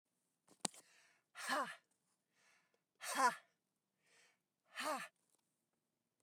{"exhalation_length": "6.2 s", "exhalation_amplitude": 4936, "exhalation_signal_mean_std_ratio": 0.29, "survey_phase": "beta (2021-08-13 to 2022-03-07)", "age": "45-64", "gender": "Female", "wearing_mask": "No", "symptom_other": true, "smoker_status": "Never smoked", "respiratory_condition_asthma": false, "respiratory_condition_other": false, "recruitment_source": "REACT", "submission_delay": "3 days", "covid_test_result": "Negative", "covid_test_method": "RT-qPCR", "influenza_a_test_result": "Negative", "influenza_b_test_result": "Negative"}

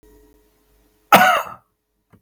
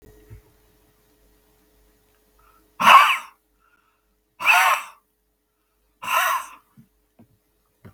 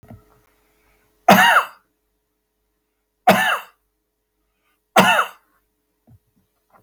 {"cough_length": "2.2 s", "cough_amplitude": 32768, "cough_signal_mean_std_ratio": 0.3, "exhalation_length": "7.9 s", "exhalation_amplitude": 32768, "exhalation_signal_mean_std_ratio": 0.28, "three_cough_length": "6.8 s", "three_cough_amplitude": 32768, "three_cough_signal_mean_std_ratio": 0.3, "survey_phase": "beta (2021-08-13 to 2022-03-07)", "age": "65+", "gender": "Male", "wearing_mask": "No", "symptom_cough_any": true, "smoker_status": "Ex-smoker", "respiratory_condition_asthma": false, "respiratory_condition_other": false, "recruitment_source": "Test and Trace", "submission_delay": "0 days", "covid_test_result": "Negative", "covid_test_method": "LFT"}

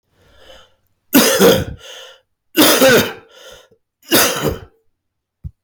{"three_cough_length": "5.6 s", "three_cough_amplitude": 32768, "three_cough_signal_mean_std_ratio": 0.45, "survey_phase": "beta (2021-08-13 to 2022-03-07)", "age": "45-64", "gender": "Male", "wearing_mask": "No", "symptom_cough_any": true, "symptom_runny_or_blocked_nose": true, "symptom_sore_throat": true, "smoker_status": "Ex-smoker", "respiratory_condition_asthma": false, "respiratory_condition_other": false, "recruitment_source": "REACT", "submission_delay": "4 days", "covid_test_result": "Negative", "covid_test_method": "RT-qPCR", "influenza_a_test_result": "Negative", "influenza_b_test_result": "Negative"}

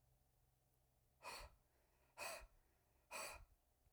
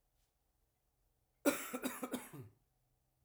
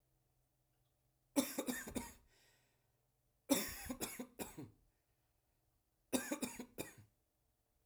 {"exhalation_length": "3.9 s", "exhalation_amplitude": 387, "exhalation_signal_mean_std_ratio": 0.45, "cough_length": "3.2 s", "cough_amplitude": 4304, "cough_signal_mean_std_ratio": 0.31, "three_cough_length": "7.9 s", "three_cough_amplitude": 3793, "three_cough_signal_mean_std_ratio": 0.34, "survey_phase": "beta (2021-08-13 to 2022-03-07)", "age": "18-44", "gender": "Male", "wearing_mask": "No", "symptom_sore_throat": true, "smoker_status": "Never smoked", "respiratory_condition_asthma": false, "respiratory_condition_other": false, "recruitment_source": "Test and Trace", "submission_delay": "1 day", "covid_test_result": "Positive", "covid_test_method": "ePCR"}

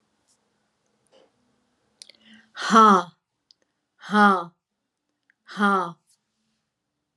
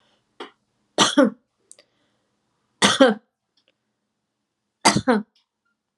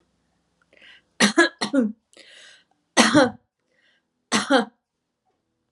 {"exhalation_length": "7.2 s", "exhalation_amplitude": 25914, "exhalation_signal_mean_std_ratio": 0.28, "three_cough_length": "6.0 s", "three_cough_amplitude": 30486, "three_cough_signal_mean_std_ratio": 0.29, "cough_length": "5.7 s", "cough_amplitude": 28551, "cough_signal_mean_std_ratio": 0.34, "survey_phase": "beta (2021-08-13 to 2022-03-07)", "age": "65+", "gender": "Female", "wearing_mask": "No", "symptom_none": true, "smoker_status": "Never smoked", "respiratory_condition_asthma": true, "respiratory_condition_other": false, "recruitment_source": "REACT", "submission_delay": "3 days", "covid_test_result": "Negative", "covid_test_method": "RT-qPCR"}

